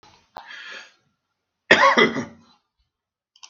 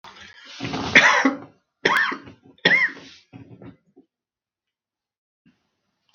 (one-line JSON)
{"cough_length": "3.5 s", "cough_amplitude": 32768, "cough_signal_mean_std_ratio": 0.3, "three_cough_length": "6.1 s", "three_cough_amplitude": 32768, "three_cough_signal_mean_std_ratio": 0.35, "survey_phase": "beta (2021-08-13 to 2022-03-07)", "age": "65+", "gender": "Male", "wearing_mask": "No", "symptom_none": true, "smoker_status": "Never smoked", "respiratory_condition_asthma": false, "respiratory_condition_other": false, "recruitment_source": "REACT", "submission_delay": "31 days", "covid_test_result": "Negative", "covid_test_method": "RT-qPCR", "influenza_a_test_result": "Unknown/Void", "influenza_b_test_result": "Unknown/Void"}